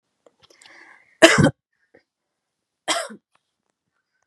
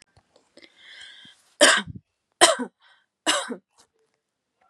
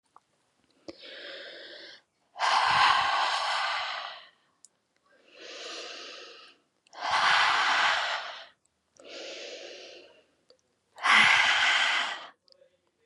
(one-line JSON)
{"cough_length": "4.3 s", "cough_amplitude": 32768, "cough_signal_mean_std_ratio": 0.22, "three_cough_length": "4.7 s", "three_cough_amplitude": 32517, "three_cough_signal_mean_std_ratio": 0.27, "exhalation_length": "13.1 s", "exhalation_amplitude": 13661, "exhalation_signal_mean_std_ratio": 0.51, "survey_phase": "beta (2021-08-13 to 2022-03-07)", "age": "18-44", "gender": "Female", "wearing_mask": "No", "symptom_none": true, "smoker_status": "Never smoked", "respiratory_condition_asthma": false, "respiratory_condition_other": false, "recruitment_source": "REACT", "submission_delay": "1 day", "covid_test_result": "Negative", "covid_test_method": "RT-qPCR", "influenza_a_test_result": "Negative", "influenza_b_test_result": "Negative"}